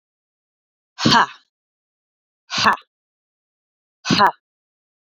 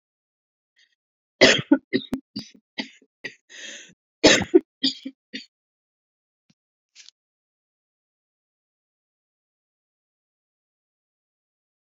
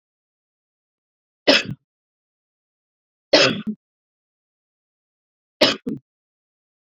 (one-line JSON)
{"exhalation_length": "5.1 s", "exhalation_amplitude": 28045, "exhalation_signal_mean_std_ratio": 0.28, "cough_length": "11.9 s", "cough_amplitude": 28291, "cough_signal_mean_std_ratio": 0.19, "three_cough_length": "6.9 s", "three_cough_amplitude": 30044, "three_cough_signal_mean_std_ratio": 0.23, "survey_phase": "beta (2021-08-13 to 2022-03-07)", "age": "45-64", "gender": "Female", "wearing_mask": "No", "symptom_cough_any": true, "symptom_runny_or_blocked_nose": true, "symptom_sore_throat": true, "symptom_fatigue": true, "symptom_headache": true, "smoker_status": "Never smoked", "respiratory_condition_asthma": false, "respiratory_condition_other": false, "recruitment_source": "Test and Trace", "submission_delay": "1 day", "covid_test_result": "Positive", "covid_test_method": "RT-qPCR", "covid_ct_value": 35.1, "covid_ct_gene": "N gene"}